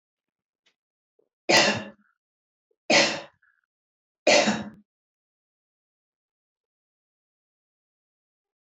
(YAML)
three_cough_length: 8.6 s
three_cough_amplitude: 16088
three_cough_signal_mean_std_ratio: 0.25
survey_phase: beta (2021-08-13 to 2022-03-07)
age: 45-64
gender: Female
wearing_mask: 'No'
symptom_none: true
smoker_status: Never smoked
respiratory_condition_asthma: false
respiratory_condition_other: false
recruitment_source: REACT
submission_delay: 2 days
covid_test_result: Negative
covid_test_method: RT-qPCR